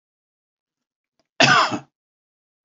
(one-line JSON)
{"cough_length": "2.6 s", "cough_amplitude": 29007, "cough_signal_mean_std_ratio": 0.28, "survey_phase": "beta (2021-08-13 to 2022-03-07)", "age": "65+", "gender": "Male", "wearing_mask": "No", "symptom_none": true, "smoker_status": "Ex-smoker", "respiratory_condition_asthma": false, "respiratory_condition_other": false, "recruitment_source": "REACT", "submission_delay": "2 days", "covid_test_result": "Negative", "covid_test_method": "RT-qPCR"}